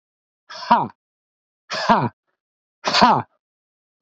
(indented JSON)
{
  "exhalation_length": "4.0 s",
  "exhalation_amplitude": 32768,
  "exhalation_signal_mean_std_ratio": 0.35,
  "survey_phase": "beta (2021-08-13 to 2022-03-07)",
  "age": "45-64",
  "gender": "Male",
  "wearing_mask": "No",
  "symptom_cough_any": true,
  "symptom_sore_throat": true,
  "symptom_fatigue": true,
  "symptom_headache": true,
  "symptom_onset": "7 days",
  "smoker_status": "Never smoked",
  "respiratory_condition_asthma": true,
  "respiratory_condition_other": false,
  "recruitment_source": "REACT",
  "submission_delay": "2 days",
  "covid_test_result": "Positive",
  "covid_test_method": "RT-qPCR",
  "covid_ct_value": 35.0,
  "covid_ct_gene": "N gene",
  "influenza_a_test_result": "Negative",
  "influenza_b_test_result": "Negative"
}